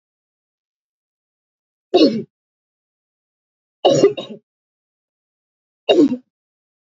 {"three_cough_length": "6.9 s", "three_cough_amplitude": 27510, "three_cough_signal_mean_std_ratio": 0.27, "survey_phase": "alpha (2021-03-01 to 2021-08-12)", "age": "45-64", "gender": "Female", "wearing_mask": "No", "symptom_cough_any": true, "symptom_headache": true, "symptom_onset": "5 days", "smoker_status": "Never smoked", "respiratory_condition_asthma": false, "respiratory_condition_other": false, "recruitment_source": "REACT", "submission_delay": "2 days", "covid_test_result": "Negative", "covid_test_method": "RT-qPCR"}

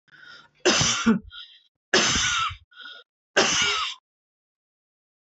{"three_cough_length": "5.4 s", "three_cough_amplitude": 17447, "three_cough_signal_mean_std_ratio": 0.48, "survey_phase": "beta (2021-08-13 to 2022-03-07)", "age": "45-64", "gender": "Female", "wearing_mask": "No", "symptom_cough_any": true, "symptom_runny_or_blocked_nose": true, "symptom_shortness_of_breath": true, "symptom_fatigue": true, "symptom_headache": true, "smoker_status": "Never smoked", "respiratory_condition_asthma": false, "respiratory_condition_other": false, "recruitment_source": "Test and Trace", "submission_delay": "3 days", "covid_test_result": "Negative", "covid_test_method": "RT-qPCR"}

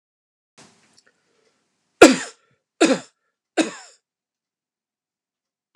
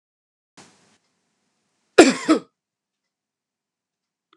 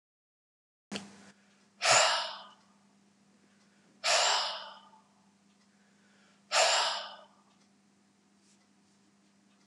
{"three_cough_length": "5.8 s", "three_cough_amplitude": 32768, "three_cough_signal_mean_std_ratio": 0.18, "cough_length": "4.4 s", "cough_amplitude": 32768, "cough_signal_mean_std_ratio": 0.18, "exhalation_length": "9.7 s", "exhalation_amplitude": 8583, "exhalation_signal_mean_std_ratio": 0.34, "survey_phase": "beta (2021-08-13 to 2022-03-07)", "age": "65+", "gender": "Male", "wearing_mask": "No", "symptom_none": true, "smoker_status": "Never smoked", "respiratory_condition_asthma": false, "respiratory_condition_other": false, "recruitment_source": "REACT", "submission_delay": "1 day", "covid_test_result": "Negative", "covid_test_method": "RT-qPCR", "influenza_a_test_result": "Negative", "influenza_b_test_result": "Negative"}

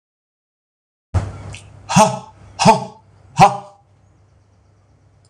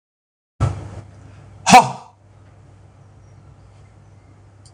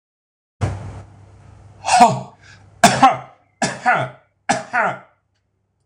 {"exhalation_length": "5.3 s", "exhalation_amplitude": 26028, "exhalation_signal_mean_std_ratio": 0.31, "cough_length": "4.7 s", "cough_amplitude": 26028, "cough_signal_mean_std_ratio": 0.24, "three_cough_length": "5.9 s", "three_cough_amplitude": 26028, "three_cough_signal_mean_std_ratio": 0.39, "survey_phase": "alpha (2021-03-01 to 2021-08-12)", "age": "65+", "gender": "Male", "wearing_mask": "No", "symptom_none": true, "smoker_status": "Ex-smoker", "respiratory_condition_asthma": false, "respiratory_condition_other": false, "recruitment_source": "REACT", "submission_delay": "12 days", "covid_test_result": "Negative", "covid_test_method": "RT-qPCR"}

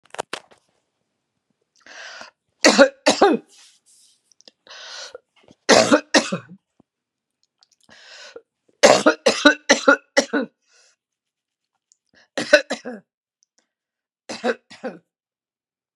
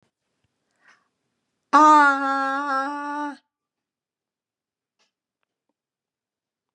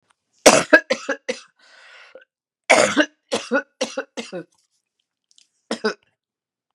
{"three_cough_length": "16.0 s", "three_cough_amplitude": 32768, "three_cough_signal_mean_std_ratio": 0.28, "exhalation_length": "6.7 s", "exhalation_amplitude": 21420, "exhalation_signal_mean_std_ratio": 0.31, "cough_length": "6.7 s", "cough_amplitude": 32768, "cough_signal_mean_std_ratio": 0.3, "survey_phase": "beta (2021-08-13 to 2022-03-07)", "age": "65+", "gender": "Female", "wearing_mask": "No", "symptom_none": true, "smoker_status": "Never smoked", "respiratory_condition_asthma": true, "respiratory_condition_other": false, "recruitment_source": "REACT", "submission_delay": "1 day", "covid_test_result": "Negative", "covid_test_method": "RT-qPCR", "influenza_a_test_result": "Negative", "influenza_b_test_result": "Negative"}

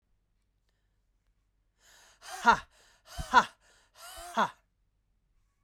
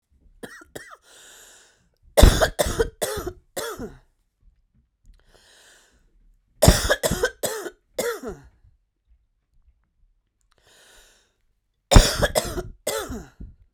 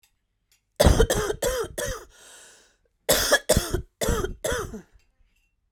{"exhalation_length": "5.6 s", "exhalation_amplitude": 13186, "exhalation_signal_mean_std_ratio": 0.22, "three_cough_length": "13.7 s", "three_cough_amplitude": 32768, "three_cough_signal_mean_std_ratio": 0.29, "cough_length": "5.7 s", "cough_amplitude": 21803, "cough_signal_mean_std_ratio": 0.45, "survey_phase": "beta (2021-08-13 to 2022-03-07)", "age": "18-44", "gender": "Female", "wearing_mask": "No", "symptom_cough_any": true, "symptom_runny_or_blocked_nose": true, "symptom_fatigue": true, "symptom_headache": true, "symptom_onset": "12 days", "smoker_status": "Ex-smoker", "respiratory_condition_asthma": false, "respiratory_condition_other": false, "recruitment_source": "REACT", "submission_delay": "3 days", "covid_test_result": "Negative", "covid_test_method": "RT-qPCR"}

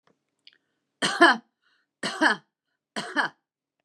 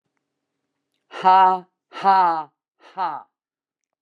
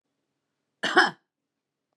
{"three_cough_length": "3.8 s", "three_cough_amplitude": 23477, "three_cough_signal_mean_std_ratio": 0.31, "exhalation_length": "4.0 s", "exhalation_amplitude": 22906, "exhalation_signal_mean_std_ratio": 0.38, "cough_length": "2.0 s", "cough_amplitude": 18030, "cough_signal_mean_std_ratio": 0.25, "survey_phase": "beta (2021-08-13 to 2022-03-07)", "age": "65+", "gender": "Female", "wearing_mask": "No", "symptom_none": true, "smoker_status": "Current smoker (11 or more cigarettes per day)", "respiratory_condition_asthma": false, "respiratory_condition_other": false, "recruitment_source": "REACT", "submission_delay": "0 days", "covid_test_result": "Negative", "covid_test_method": "RT-qPCR"}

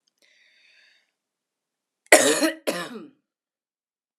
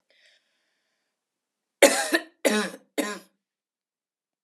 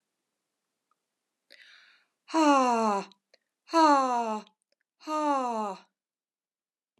{"cough_length": "4.2 s", "cough_amplitude": 32768, "cough_signal_mean_std_ratio": 0.25, "three_cough_length": "4.4 s", "three_cough_amplitude": 32274, "three_cough_signal_mean_std_ratio": 0.27, "exhalation_length": "7.0 s", "exhalation_amplitude": 9802, "exhalation_signal_mean_std_ratio": 0.4, "survey_phase": "alpha (2021-03-01 to 2021-08-12)", "age": "45-64", "gender": "Female", "wearing_mask": "No", "symptom_none": true, "smoker_status": "Never smoked", "respiratory_condition_asthma": false, "respiratory_condition_other": false, "recruitment_source": "REACT", "submission_delay": "2 days", "covid_test_result": "Negative", "covid_test_method": "RT-qPCR"}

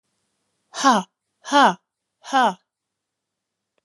{"exhalation_length": "3.8 s", "exhalation_amplitude": 26456, "exhalation_signal_mean_std_ratio": 0.32, "survey_phase": "alpha (2021-03-01 to 2021-08-12)", "age": "65+", "gender": "Female", "wearing_mask": "No", "symptom_none": true, "smoker_status": "Never smoked", "respiratory_condition_asthma": false, "respiratory_condition_other": false, "recruitment_source": "REACT", "submission_delay": "1 day", "covid_test_result": "Negative", "covid_test_method": "RT-qPCR"}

